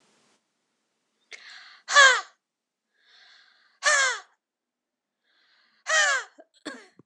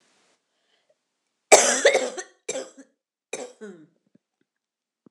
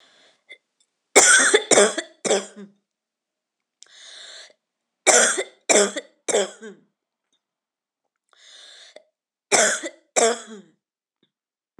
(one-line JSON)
{"exhalation_length": "7.1 s", "exhalation_amplitude": 22653, "exhalation_signal_mean_std_ratio": 0.28, "cough_length": "5.1 s", "cough_amplitude": 26028, "cough_signal_mean_std_ratio": 0.26, "three_cough_length": "11.8 s", "three_cough_amplitude": 26028, "three_cough_signal_mean_std_ratio": 0.34, "survey_phase": "beta (2021-08-13 to 2022-03-07)", "age": "45-64", "gender": "Female", "wearing_mask": "No", "symptom_headache": true, "symptom_onset": "5 days", "smoker_status": "Ex-smoker", "respiratory_condition_asthma": false, "respiratory_condition_other": false, "recruitment_source": "REACT", "submission_delay": "1 day", "covid_test_result": "Negative", "covid_test_method": "RT-qPCR"}